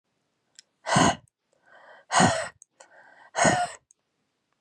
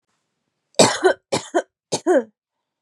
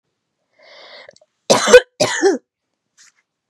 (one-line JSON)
{"exhalation_length": "4.6 s", "exhalation_amplitude": 18174, "exhalation_signal_mean_std_ratio": 0.36, "three_cough_length": "2.8 s", "three_cough_amplitude": 31272, "three_cough_signal_mean_std_ratio": 0.37, "cough_length": "3.5 s", "cough_amplitude": 32768, "cough_signal_mean_std_ratio": 0.3, "survey_phase": "beta (2021-08-13 to 2022-03-07)", "age": "18-44", "gender": "Female", "wearing_mask": "No", "symptom_none": true, "smoker_status": "Never smoked", "respiratory_condition_asthma": true, "respiratory_condition_other": false, "recruitment_source": "REACT", "submission_delay": "4 days", "covid_test_result": "Negative", "covid_test_method": "RT-qPCR", "influenza_a_test_result": "Negative", "influenza_b_test_result": "Negative"}